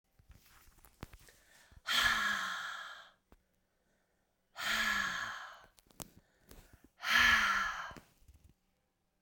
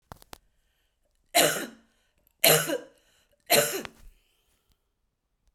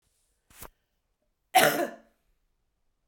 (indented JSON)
{
  "exhalation_length": "9.2 s",
  "exhalation_amplitude": 5756,
  "exhalation_signal_mean_std_ratio": 0.43,
  "three_cough_length": "5.5 s",
  "three_cough_amplitude": 31087,
  "three_cough_signal_mean_std_ratio": 0.3,
  "cough_length": "3.1 s",
  "cough_amplitude": 24204,
  "cough_signal_mean_std_ratio": 0.25,
  "survey_phase": "beta (2021-08-13 to 2022-03-07)",
  "age": "45-64",
  "gender": "Female",
  "wearing_mask": "No",
  "symptom_cough_any": true,
  "symptom_runny_or_blocked_nose": true,
  "symptom_fatigue": true,
  "symptom_change_to_sense_of_smell_or_taste": true,
  "symptom_loss_of_taste": true,
  "symptom_onset": "3 days",
  "smoker_status": "Never smoked",
  "respiratory_condition_asthma": false,
  "respiratory_condition_other": false,
  "recruitment_source": "Test and Trace",
  "submission_delay": "2 days",
  "covid_test_result": "Positive",
  "covid_test_method": "RT-qPCR"
}